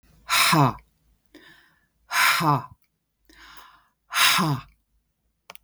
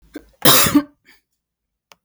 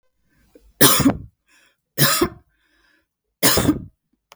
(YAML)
exhalation_length: 5.6 s
exhalation_amplitude: 24273
exhalation_signal_mean_std_ratio: 0.42
cough_length: 2.0 s
cough_amplitude: 32768
cough_signal_mean_std_ratio: 0.35
three_cough_length: 4.4 s
three_cough_amplitude: 32768
three_cough_signal_mean_std_ratio: 0.38
survey_phase: beta (2021-08-13 to 2022-03-07)
age: 45-64
gender: Female
wearing_mask: 'No'
symptom_none: true
smoker_status: Ex-smoker
respiratory_condition_asthma: false
respiratory_condition_other: false
recruitment_source: REACT
submission_delay: 4 days
covid_test_result: Negative
covid_test_method: RT-qPCR
influenza_a_test_result: Negative
influenza_b_test_result: Negative